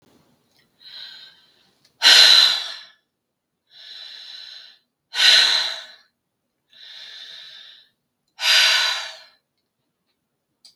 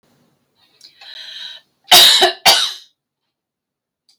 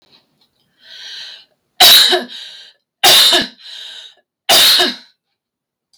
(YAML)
exhalation_length: 10.8 s
exhalation_amplitude: 32768
exhalation_signal_mean_std_ratio: 0.34
cough_length: 4.2 s
cough_amplitude: 32768
cough_signal_mean_std_ratio: 0.34
three_cough_length: 6.0 s
three_cough_amplitude: 32768
three_cough_signal_mean_std_ratio: 0.45
survey_phase: beta (2021-08-13 to 2022-03-07)
age: 45-64
gender: Female
wearing_mask: 'No'
symptom_none: true
smoker_status: Ex-smoker
respiratory_condition_asthma: false
respiratory_condition_other: false
recruitment_source: REACT
submission_delay: 16 days
covid_test_result: Negative
covid_test_method: RT-qPCR
influenza_a_test_result: Negative
influenza_b_test_result: Negative